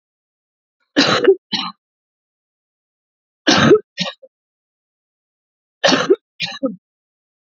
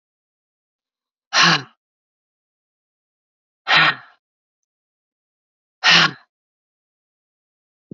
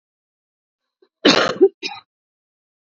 {"three_cough_length": "7.6 s", "three_cough_amplitude": 32768, "three_cough_signal_mean_std_ratio": 0.32, "exhalation_length": "7.9 s", "exhalation_amplitude": 30234, "exhalation_signal_mean_std_ratio": 0.25, "cough_length": "3.0 s", "cough_amplitude": 32767, "cough_signal_mean_std_ratio": 0.28, "survey_phase": "beta (2021-08-13 to 2022-03-07)", "age": "45-64", "gender": "Female", "wearing_mask": "No", "symptom_cough_any": true, "symptom_runny_or_blocked_nose": true, "symptom_sore_throat": true, "symptom_fatigue": true, "symptom_headache": true, "smoker_status": "Current smoker (1 to 10 cigarettes per day)", "respiratory_condition_asthma": false, "respiratory_condition_other": false, "recruitment_source": "Test and Trace", "submission_delay": "3 days", "covid_test_result": "Negative", "covid_test_method": "ePCR"}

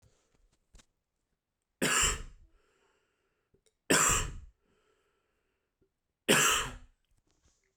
{"three_cough_length": "7.8 s", "three_cough_amplitude": 9373, "three_cough_signal_mean_std_ratio": 0.32, "survey_phase": "beta (2021-08-13 to 2022-03-07)", "age": "18-44", "gender": "Male", "wearing_mask": "No", "symptom_cough_any": true, "symptom_runny_or_blocked_nose": true, "symptom_abdominal_pain": true, "symptom_fatigue": true, "symptom_headache": true, "symptom_other": true, "smoker_status": "Ex-smoker", "respiratory_condition_asthma": false, "respiratory_condition_other": false, "recruitment_source": "Test and Trace", "submission_delay": "2 days", "covid_test_result": "Positive", "covid_test_method": "RT-qPCR", "covid_ct_value": 27.4, "covid_ct_gene": "N gene"}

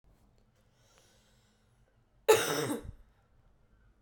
{"cough_length": "4.0 s", "cough_amplitude": 10852, "cough_signal_mean_std_ratio": 0.26, "survey_phase": "beta (2021-08-13 to 2022-03-07)", "age": "18-44", "gender": "Female", "wearing_mask": "No", "symptom_cough_any": true, "symptom_runny_or_blocked_nose": true, "symptom_sore_throat": true, "symptom_fatigue": true, "symptom_fever_high_temperature": true, "symptom_change_to_sense_of_smell_or_taste": true, "symptom_loss_of_taste": true, "symptom_onset": "2 days", "smoker_status": "Never smoked", "respiratory_condition_asthma": true, "respiratory_condition_other": false, "recruitment_source": "Test and Trace", "submission_delay": "1 day", "covid_test_result": "Positive", "covid_test_method": "RT-qPCR", "covid_ct_value": 14.7, "covid_ct_gene": "ORF1ab gene", "covid_ct_mean": 15.0, "covid_viral_load": "12000000 copies/ml", "covid_viral_load_category": "High viral load (>1M copies/ml)"}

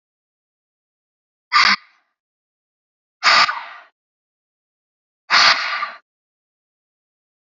{"exhalation_length": "7.5 s", "exhalation_amplitude": 32042, "exhalation_signal_mean_std_ratio": 0.29, "survey_phase": "beta (2021-08-13 to 2022-03-07)", "age": "18-44", "gender": "Female", "wearing_mask": "No", "symptom_cough_any": true, "symptom_runny_or_blocked_nose": true, "symptom_shortness_of_breath": true, "symptom_fatigue": true, "symptom_headache": true, "symptom_change_to_sense_of_smell_or_taste": true, "symptom_onset": "6 days", "smoker_status": "Ex-smoker", "respiratory_condition_asthma": false, "respiratory_condition_other": false, "recruitment_source": "Test and Trace", "submission_delay": "2 days", "covid_test_result": "Positive", "covid_test_method": "RT-qPCR", "covid_ct_value": 19.0, "covid_ct_gene": "ORF1ab gene", "covid_ct_mean": 19.5, "covid_viral_load": "390000 copies/ml", "covid_viral_load_category": "Low viral load (10K-1M copies/ml)"}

